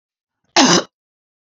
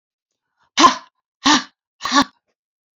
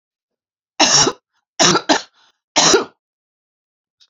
{"cough_length": "1.5 s", "cough_amplitude": 32462, "cough_signal_mean_std_ratio": 0.33, "exhalation_length": "3.0 s", "exhalation_amplitude": 32451, "exhalation_signal_mean_std_ratio": 0.31, "three_cough_length": "4.1 s", "three_cough_amplitude": 32723, "three_cough_signal_mean_std_ratio": 0.38, "survey_phase": "alpha (2021-03-01 to 2021-08-12)", "age": "45-64", "gender": "Female", "wearing_mask": "No", "symptom_cough_any": true, "smoker_status": "Current smoker (11 or more cigarettes per day)", "respiratory_condition_asthma": false, "respiratory_condition_other": false, "recruitment_source": "REACT", "submission_delay": "1 day", "covid_test_result": "Negative", "covid_test_method": "RT-qPCR"}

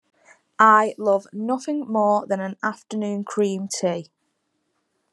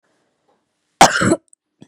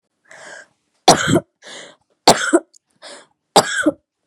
{"exhalation_length": "5.1 s", "exhalation_amplitude": 25914, "exhalation_signal_mean_std_ratio": 0.53, "cough_length": "1.9 s", "cough_amplitude": 32768, "cough_signal_mean_std_ratio": 0.3, "three_cough_length": "4.3 s", "three_cough_amplitude": 32768, "three_cough_signal_mean_std_ratio": 0.34, "survey_phase": "beta (2021-08-13 to 2022-03-07)", "age": "18-44", "gender": "Female", "wearing_mask": "No", "symptom_runny_or_blocked_nose": true, "symptom_sore_throat": true, "smoker_status": "Never smoked", "respiratory_condition_asthma": false, "respiratory_condition_other": false, "recruitment_source": "REACT", "submission_delay": "1 day", "covid_test_result": "Negative", "covid_test_method": "RT-qPCR", "influenza_a_test_result": "Negative", "influenza_b_test_result": "Negative"}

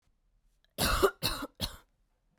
{"three_cough_length": "2.4 s", "three_cough_amplitude": 9318, "three_cough_signal_mean_std_ratio": 0.39, "survey_phase": "beta (2021-08-13 to 2022-03-07)", "age": "18-44", "gender": "Female", "wearing_mask": "No", "symptom_cough_any": true, "symptom_sore_throat": true, "symptom_diarrhoea": true, "symptom_fatigue": true, "smoker_status": "Never smoked", "respiratory_condition_asthma": false, "respiratory_condition_other": false, "recruitment_source": "Test and Trace", "submission_delay": "1 day", "covid_test_result": "Positive", "covid_test_method": "RT-qPCR", "covid_ct_value": 22.5, "covid_ct_gene": "ORF1ab gene", "covid_ct_mean": 23.4, "covid_viral_load": "22000 copies/ml", "covid_viral_load_category": "Low viral load (10K-1M copies/ml)"}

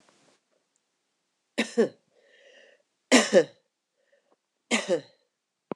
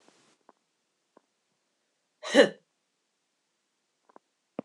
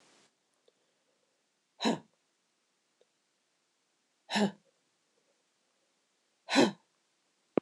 {"three_cough_length": "5.8 s", "three_cough_amplitude": 19619, "three_cough_signal_mean_std_ratio": 0.26, "cough_length": "4.6 s", "cough_amplitude": 18086, "cough_signal_mean_std_ratio": 0.15, "exhalation_length": "7.6 s", "exhalation_amplitude": 9315, "exhalation_signal_mean_std_ratio": 0.2, "survey_phase": "beta (2021-08-13 to 2022-03-07)", "age": "45-64", "gender": "Female", "wearing_mask": "No", "symptom_cough_any": true, "symptom_runny_or_blocked_nose": true, "symptom_fatigue": true, "symptom_change_to_sense_of_smell_or_taste": true, "smoker_status": "Never smoked", "respiratory_condition_asthma": false, "respiratory_condition_other": false, "recruitment_source": "Test and Trace", "submission_delay": "2 days", "covid_test_result": "Positive", "covid_test_method": "RT-qPCR"}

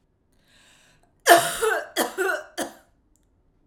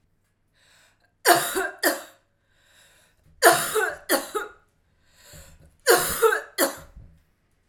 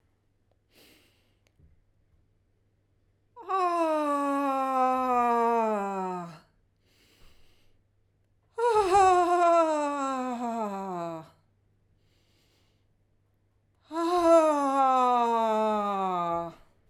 {"cough_length": "3.7 s", "cough_amplitude": 29399, "cough_signal_mean_std_ratio": 0.36, "three_cough_length": "7.7 s", "three_cough_amplitude": 32225, "three_cough_signal_mean_std_ratio": 0.38, "exhalation_length": "16.9 s", "exhalation_amplitude": 9361, "exhalation_signal_mean_std_ratio": 0.62, "survey_phase": "beta (2021-08-13 to 2022-03-07)", "age": "45-64", "gender": "Female", "wearing_mask": "No", "symptom_cough_any": true, "symptom_onset": "4 days", "smoker_status": "Never smoked", "respiratory_condition_asthma": false, "respiratory_condition_other": false, "recruitment_source": "Test and Trace", "submission_delay": "3 days", "covid_test_result": "Negative", "covid_test_method": "RT-qPCR"}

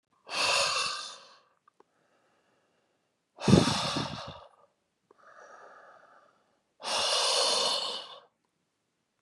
{"exhalation_length": "9.2 s", "exhalation_amplitude": 17033, "exhalation_signal_mean_std_ratio": 0.42, "survey_phase": "beta (2021-08-13 to 2022-03-07)", "age": "18-44", "gender": "Male", "wearing_mask": "No", "symptom_none": true, "symptom_onset": "5 days", "smoker_status": "Never smoked", "respiratory_condition_asthma": false, "respiratory_condition_other": false, "recruitment_source": "Test and Trace", "submission_delay": "2 days", "covid_test_result": "Positive", "covid_test_method": "RT-qPCR", "covid_ct_value": 18.1, "covid_ct_gene": "ORF1ab gene", "covid_ct_mean": 18.4, "covid_viral_load": "890000 copies/ml", "covid_viral_load_category": "Low viral load (10K-1M copies/ml)"}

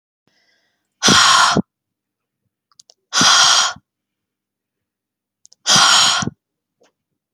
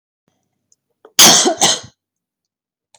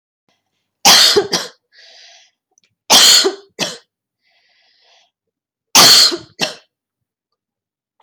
{"exhalation_length": "7.3 s", "exhalation_amplitude": 32768, "exhalation_signal_mean_std_ratio": 0.41, "cough_length": "3.0 s", "cough_amplitude": 32768, "cough_signal_mean_std_ratio": 0.34, "three_cough_length": "8.0 s", "three_cough_amplitude": 32768, "three_cough_signal_mean_std_ratio": 0.36, "survey_phase": "beta (2021-08-13 to 2022-03-07)", "age": "18-44", "gender": "Female", "wearing_mask": "No", "symptom_none": true, "smoker_status": "Never smoked", "respiratory_condition_asthma": false, "respiratory_condition_other": false, "recruitment_source": "REACT", "submission_delay": "2 days", "covid_test_result": "Negative", "covid_test_method": "RT-qPCR", "influenza_a_test_result": "Negative", "influenza_b_test_result": "Negative"}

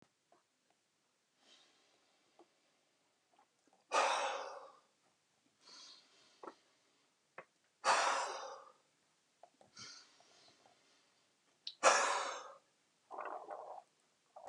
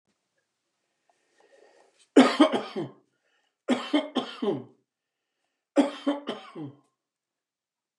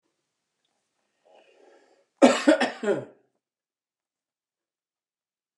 {"exhalation_length": "14.5 s", "exhalation_amplitude": 6015, "exhalation_signal_mean_std_ratio": 0.3, "three_cough_length": "8.0 s", "three_cough_amplitude": 20704, "three_cough_signal_mean_std_ratio": 0.29, "cough_length": "5.6 s", "cough_amplitude": 26425, "cough_signal_mean_std_ratio": 0.23, "survey_phase": "beta (2021-08-13 to 2022-03-07)", "age": "65+", "gender": "Male", "wearing_mask": "No", "symptom_cough_any": true, "symptom_shortness_of_breath": true, "smoker_status": "Ex-smoker", "respiratory_condition_asthma": false, "respiratory_condition_other": false, "recruitment_source": "REACT", "submission_delay": "3 days", "covid_test_result": "Negative", "covid_test_method": "RT-qPCR", "influenza_a_test_result": "Negative", "influenza_b_test_result": "Negative"}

